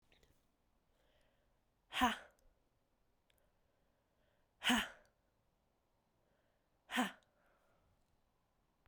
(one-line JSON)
{"exhalation_length": "8.9 s", "exhalation_amplitude": 2932, "exhalation_signal_mean_std_ratio": 0.22, "survey_phase": "alpha (2021-03-01 to 2021-08-12)", "age": "18-44", "gender": "Female", "wearing_mask": "No", "symptom_cough_any": true, "symptom_headache": true, "smoker_status": "Never smoked", "respiratory_condition_asthma": false, "respiratory_condition_other": false, "recruitment_source": "Test and Trace", "submission_delay": "2 days", "covid_test_result": "Positive", "covid_test_method": "RT-qPCR", "covid_ct_value": 18.5, "covid_ct_gene": "ORF1ab gene", "covid_ct_mean": 19.7, "covid_viral_load": "340000 copies/ml", "covid_viral_load_category": "Low viral load (10K-1M copies/ml)"}